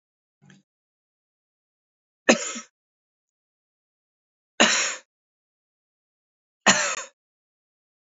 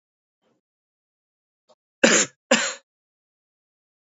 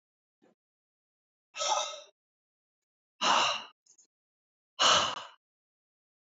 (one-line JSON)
{"three_cough_length": "8.0 s", "three_cough_amplitude": 29147, "three_cough_signal_mean_std_ratio": 0.22, "cough_length": "4.2 s", "cough_amplitude": 27794, "cough_signal_mean_std_ratio": 0.23, "exhalation_length": "6.3 s", "exhalation_amplitude": 9168, "exhalation_signal_mean_std_ratio": 0.32, "survey_phase": "beta (2021-08-13 to 2022-03-07)", "age": "18-44", "gender": "Male", "wearing_mask": "No", "symptom_sore_throat": true, "smoker_status": "Never smoked", "respiratory_condition_asthma": false, "respiratory_condition_other": false, "recruitment_source": "REACT", "submission_delay": "1 day", "covid_test_result": "Negative", "covid_test_method": "RT-qPCR", "influenza_a_test_result": "Unknown/Void", "influenza_b_test_result": "Unknown/Void"}